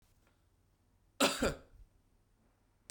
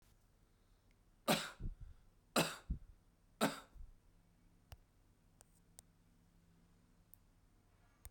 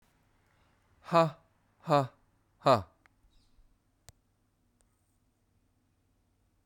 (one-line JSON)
{"cough_length": "2.9 s", "cough_amplitude": 5436, "cough_signal_mean_std_ratio": 0.27, "three_cough_length": "8.1 s", "three_cough_amplitude": 3504, "three_cough_signal_mean_std_ratio": 0.28, "exhalation_length": "6.7 s", "exhalation_amplitude": 10256, "exhalation_signal_mean_std_ratio": 0.22, "survey_phase": "beta (2021-08-13 to 2022-03-07)", "age": "45-64", "gender": "Male", "wearing_mask": "No", "symptom_cough_any": true, "symptom_runny_or_blocked_nose": true, "symptom_fatigue": true, "smoker_status": "Never smoked", "respiratory_condition_asthma": false, "respiratory_condition_other": false, "recruitment_source": "Test and Trace", "submission_delay": "3 days", "covid_test_result": "Positive", "covid_test_method": "LFT"}